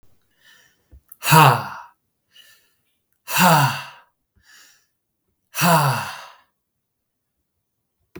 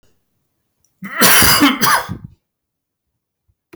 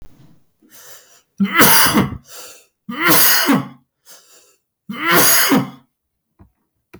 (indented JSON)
{
  "exhalation_length": "8.2 s",
  "exhalation_amplitude": 32766,
  "exhalation_signal_mean_std_ratio": 0.32,
  "cough_length": "3.8 s",
  "cough_amplitude": 32768,
  "cough_signal_mean_std_ratio": 0.42,
  "three_cough_length": "7.0 s",
  "three_cough_amplitude": 32768,
  "three_cough_signal_mean_std_ratio": 0.49,
  "survey_phase": "beta (2021-08-13 to 2022-03-07)",
  "age": "18-44",
  "gender": "Male",
  "wearing_mask": "No",
  "symptom_none": true,
  "smoker_status": "Current smoker (e-cigarettes or vapes only)",
  "respiratory_condition_asthma": false,
  "respiratory_condition_other": false,
  "recruitment_source": "REACT",
  "submission_delay": "0 days",
  "covid_test_result": "Negative",
  "covid_test_method": "RT-qPCR"
}